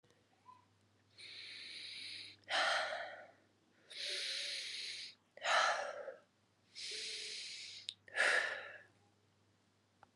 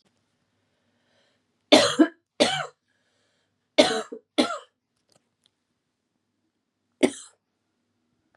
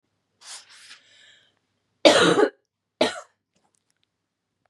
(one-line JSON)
{"exhalation_length": "10.2 s", "exhalation_amplitude": 3102, "exhalation_signal_mean_std_ratio": 0.52, "three_cough_length": "8.4 s", "three_cough_amplitude": 27499, "three_cough_signal_mean_std_ratio": 0.24, "cough_length": "4.7 s", "cough_amplitude": 32647, "cough_signal_mean_std_ratio": 0.27, "survey_phase": "beta (2021-08-13 to 2022-03-07)", "age": "18-44", "gender": "Female", "wearing_mask": "No", "symptom_cough_any": true, "symptom_runny_or_blocked_nose": true, "symptom_headache": true, "symptom_change_to_sense_of_smell_or_taste": true, "symptom_loss_of_taste": true, "symptom_onset": "3 days", "smoker_status": "Ex-smoker", "respiratory_condition_asthma": true, "respiratory_condition_other": false, "recruitment_source": "Test and Trace", "submission_delay": "2 days", "covid_test_result": "Positive", "covid_test_method": "RT-qPCR", "covid_ct_value": 18.1, "covid_ct_gene": "ORF1ab gene", "covid_ct_mean": 18.6, "covid_viral_load": "810000 copies/ml", "covid_viral_load_category": "Low viral load (10K-1M copies/ml)"}